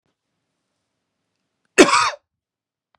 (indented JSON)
{
  "cough_length": "3.0 s",
  "cough_amplitude": 32767,
  "cough_signal_mean_std_ratio": 0.23,
  "survey_phase": "beta (2021-08-13 to 2022-03-07)",
  "age": "18-44",
  "gender": "Male",
  "wearing_mask": "No",
  "symptom_fatigue": true,
  "symptom_headache": true,
  "smoker_status": "Current smoker (1 to 10 cigarettes per day)",
  "respiratory_condition_asthma": false,
  "respiratory_condition_other": false,
  "recruitment_source": "REACT",
  "submission_delay": "2 days",
  "covid_test_result": "Negative",
  "covid_test_method": "RT-qPCR"
}